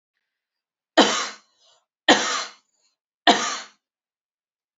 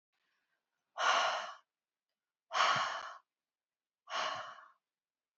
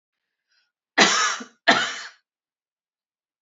{"three_cough_length": "4.8 s", "three_cough_amplitude": 30727, "three_cough_signal_mean_std_ratio": 0.29, "exhalation_length": "5.4 s", "exhalation_amplitude": 5419, "exhalation_signal_mean_std_ratio": 0.4, "cough_length": "3.4 s", "cough_amplitude": 29244, "cough_signal_mean_std_ratio": 0.33, "survey_phase": "beta (2021-08-13 to 2022-03-07)", "age": "18-44", "gender": "Female", "wearing_mask": "No", "symptom_none": true, "smoker_status": "Never smoked", "respiratory_condition_asthma": false, "respiratory_condition_other": false, "recruitment_source": "REACT", "submission_delay": "2 days", "covid_test_result": "Negative", "covid_test_method": "RT-qPCR", "influenza_a_test_result": "Negative", "influenza_b_test_result": "Negative"}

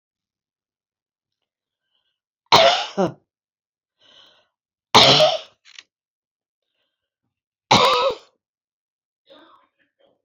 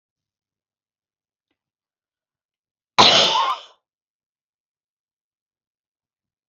{"three_cough_length": "10.2 s", "three_cough_amplitude": 31033, "three_cough_signal_mean_std_ratio": 0.28, "cough_length": "6.5 s", "cough_amplitude": 31038, "cough_signal_mean_std_ratio": 0.22, "survey_phase": "beta (2021-08-13 to 2022-03-07)", "age": "65+", "gender": "Female", "wearing_mask": "No", "symptom_none": true, "smoker_status": "Never smoked", "respiratory_condition_asthma": false, "respiratory_condition_other": false, "recruitment_source": "REACT", "submission_delay": "1 day", "covid_test_result": "Negative", "covid_test_method": "RT-qPCR", "influenza_a_test_result": "Negative", "influenza_b_test_result": "Negative"}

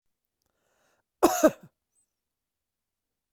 {"cough_length": "3.3 s", "cough_amplitude": 18636, "cough_signal_mean_std_ratio": 0.19, "survey_phase": "alpha (2021-03-01 to 2021-08-12)", "age": "65+", "gender": "Male", "wearing_mask": "No", "symptom_cough_any": true, "symptom_headache": true, "smoker_status": "Never smoked", "respiratory_condition_asthma": false, "respiratory_condition_other": false, "recruitment_source": "Test and Trace", "submission_delay": "2 days", "covid_test_result": "Positive", "covid_test_method": "RT-qPCR"}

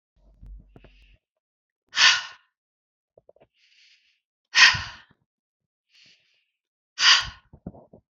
{"exhalation_length": "8.1 s", "exhalation_amplitude": 31030, "exhalation_signal_mean_std_ratio": 0.24, "survey_phase": "beta (2021-08-13 to 2022-03-07)", "age": "18-44", "gender": "Female", "wearing_mask": "No", "symptom_sore_throat": true, "smoker_status": "Never smoked", "respiratory_condition_asthma": false, "respiratory_condition_other": false, "recruitment_source": "Test and Trace", "submission_delay": "0 days", "covid_test_result": "Negative", "covid_test_method": "RT-qPCR"}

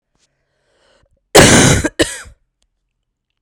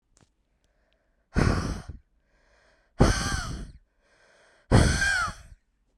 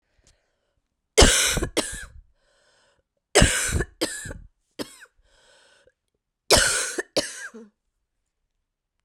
{"cough_length": "3.4 s", "cough_amplitude": 32768, "cough_signal_mean_std_ratio": 0.34, "exhalation_length": "6.0 s", "exhalation_amplitude": 22802, "exhalation_signal_mean_std_ratio": 0.39, "three_cough_length": "9.0 s", "three_cough_amplitude": 32199, "three_cough_signal_mean_std_ratio": 0.33, "survey_phase": "beta (2021-08-13 to 2022-03-07)", "age": "18-44", "gender": "Female", "wearing_mask": "No", "symptom_cough_any": true, "symptom_new_continuous_cough": true, "symptom_runny_or_blocked_nose": true, "symptom_shortness_of_breath": true, "symptom_sore_throat": true, "symptom_fatigue": true, "symptom_headache": true, "symptom_onset": "3 days", "smoker_status": "Current smoker (e-cigarettes or vapes only)", "respiratory_condition_asthma": false, "respiratory_condition_other": false, "recruitment_source": "Test and Trace", "submission_delay": "1 day", "covid_test_result": "Positive", "covid_test_method": "RT-qPCR"}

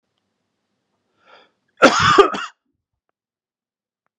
{"cough_length": "4.2 s", "cough_amplitude": 32768, "cough_signal_mean_std_ratio": 0.26, "survey_phase": "beta (2021-08-13 to 2022-03-07)", "age": "45-64", "gender": "Male", "wearing_mask": "No", "symptom_none": true, "smoker_status": "Never smoked", "respiratory_condition_asthma": false, "respiratory_condition_other": false, "recruitment_source": "REACT", "submission_delay": "2 days", "covid_test_result": "Negative", "covid_test_method": "RT-qPCR", "influenza_a_test_result": "Negative", "influenza_b_test_result": "Negative"}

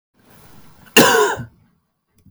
{"cough_length": "2.3 s", "cough_amplitude": 32768, "cough_signal_mean_std_ratio": 0.35, "survey_phase": "beta (2021-08-13 to 2022-03-07)", "age": "45-64", "gender": "Male", "wearing_mask": "No", "symptom_cough_any": true, "symptom_fatigue": true, "symptom_fever_high_temperature": true, "symptom_headache": true, "symptom_onset": "2 days", "smoker_status": "Ex-smoker", "respiratory_condition_asthma": false, "respiratory_condition_other": false, "recruitment_source": "Test and Trace", "submission_delay": "1 day", "covid_test_result": "Positive", "covid_test_method": "RT-qPCR", "covid_ct_value": 26.3, "covid_ct_gene": "ORF1ab gene", "covid_ct_mean": 26.9, "covid_viral_load": "1500 copies/ml", "covid_viral_load_category": "Minimal viral load (< 10K copies/ml)"}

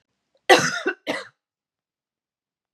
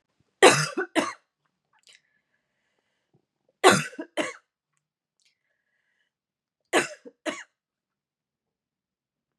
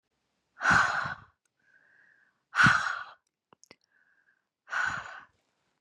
{"cough_length": "2.7 s", "cough_amplitude": 30706, "cough_signal_mean_std_ratio": 0.27, "three_cough_length": "9.4 s", "three_cough_amplitude": 27183, "three_cough_signal_mean_std_ratio": 0.22, "exhalation_length": "5.8 s", "exhalation_amplitude": 11789, "exhalation_signal_mean_std_ratio": 0.35, "survey_phase": "beta (2021-08-13 to 2022-03-07)", "age": "18-44", "gender": "Female", "wearing_mask": "No", "symptom_cough_any": true, "symptom_runny_or_blocked_nose": true, "symptom_shortness_of_breath": true, "symptom_sore_throat": true, "symptom_fatigue": true, "symptom_headache": true, "symptom_onset": "3 days", "smoker_status": "Never smoked", "respiratory_condition_asthma": false, "respiratory_condition_other": false, "recruitment_source": "Test and Trace", "submission_delay": "2 days", "covid_test_result": "Positive", "covid_test_method": "RT-qPCR", "covid_ct_value": 29.1, "covid_ct_gene": "ORF1ab gene"}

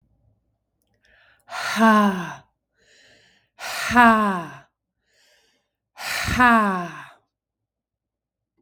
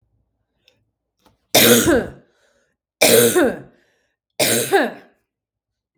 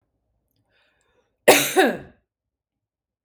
{"exhalation_length": "8.6 s", "exhalation_amplitude": 27588, "exhalation_signal_mean_std_ratio": 0.37, "three_cough_length": "6.0 s", "three_cough_amplitude": 32768, "three_cough_signal_mean_std_ratio": 0.41, "cough_length": "3.2 s", "cough_amplitude": 32768, "cough_signal_mean_std_ratio": 0.27, "survey_phase": "beta (2021-08-13 to 2022-03-07)", "age": "45-64", "gender": "Female", "wearing_mask": "No", "symptom_none": true, "smoker_status": "Never smoked", "respiratory_condition_asthma": false, "respiratory_condition_other": false, "recruitment_source": "REACT", "submission_delay": "1 day", "covid_test_result": "Negative", "covid_test_method": "RT-qPCR"}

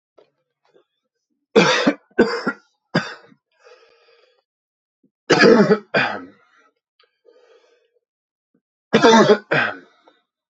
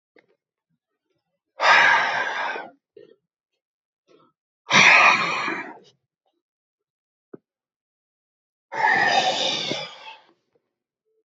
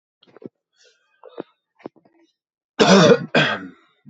{"three_cough_length": "10.5 s", "three_cough_amplitude": 32705, "three_cough_signal_mean_std_ratio": 0.34, "exhalation_length": "11.3 s", "exhalation_amplitude": 28051, "exhalation_signal_mean_std_ratio": 0.38, "cough_length": "4.1 s", "cough_amplitude": 29986, "cough_signal_mean_std_ratio": 0.32, "survey_phase": "beta (2021-08-13 to 2022-03-07)", "age": "18-44", "gender": "Male", "wearing_mask": "No", "symptom_cough_any": true, "symptom_runny_or_blocked_nose": true, "symptom_sore_throat": true, "symptom_fever_high_temperature": true, "symptom_headache": true, "smoker_status": "Current smoker (e-cigarettes or vapes only)", "respiratory_condition_asthma": true, "respiratory_condition_other": false, "recruitment_source": "Test and Trace", "submission_delay": "1 day", "covid_test_result": "Positive", "covid_test_method": "RT-qPCR", "covid_ct_value": 20.0, "covid_ct_gene": "ORF1ab gene", "covid_ct_mean": 20.7, "covid_viral_load": "160000 copies/ml", "covid_viral_load_category": "Low viral load (10K-1M copies/ml)"}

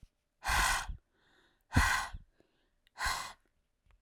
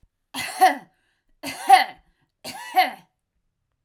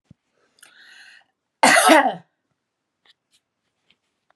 {"exhalation_length": "4.0 s", "exhalation_amplitude": 8172, "exhalation_signal_mean_std_ratio": 0.42, "three_cough_length": "3.8 s", "three_cough_amplitude": 30264, "three_cough_signal_mean_std_ratio": 0.32, "cough_length": "4.4 s", "cough_amplitude": 31521, "cough_signal_mean_std_ratio": 0.27, "survey_phase": "alpha (2021-03-01 to 2021-08-12)", "age": "45-64", "gender": "Female", "wearing_mask": "No", "symptom_none": true, "smoker_status": "Ex-smoker", "respiratory_condition_asthma": false, "respiratory_condition_other": false, "recruitment_source": "REACT", "submission_delay": "1 day", "covid_test_result": "Negative", "covid_test_method": "RT-qPCR"}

